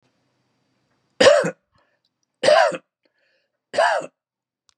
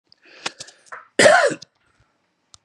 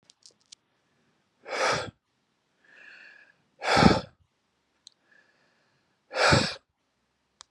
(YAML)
three_cough_length: 4.8 s
three_cough_amplitude: 28856
three_cough_signal_mean_std_ratio: 0.33
cough_length: 2.6 s
cough_amplitude: 32549
cough_signal_mean_std_ratio: 0.31
exhalation_length: 7.5 s
exhalation_amplitude: 22534
exhalation_signal_mean_std_ratio: 0.29
survey_phase: beta (2021-08-13 to 2022-03-07)
age: 45-64
gender: Male
wearing_mask: 'No'
symptom_none: true
smoker_status: Ex-smoker
respiratory_condition_asthma: false
respiratory_condition_other: false
recruitment_source: Test and Trace
submission_delay: 1 day
covid_test_result: Positive
covid_test_method: RT-qPCR
covid_ct_value: 28.8
covid_ct_gene: N gene
covid_ct_mean: 29.4
covid_viral_load: 240 copies/ml
covid_viral_load_category: Minimal viral load (< 10K copies/ml)